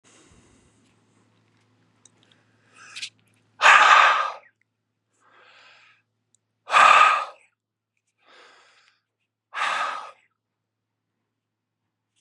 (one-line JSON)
{"exhalation_length": "12.2 s", "exhalation_amplitude": 30574, "exhalation_signal_mean_std_ratio": 0.28, "survey_phase": "beta (2021-08-13 to 2022-03-07)", "age": "18-44", "gender": "Male", "wearing_mask": "No", "symptom_abdominal_pain": true, "symptom_fatigue": true, "symptom_onset": "12 days", "smoker_status": "Never smoked", "respiratory_condition_asthma": false, "respiratory_condition_other": false, "recruitment_source": "REACT", "submission_delay": "2 days", "covid_test_result": "Negative", "covid_test_method": "RT-qPCR"}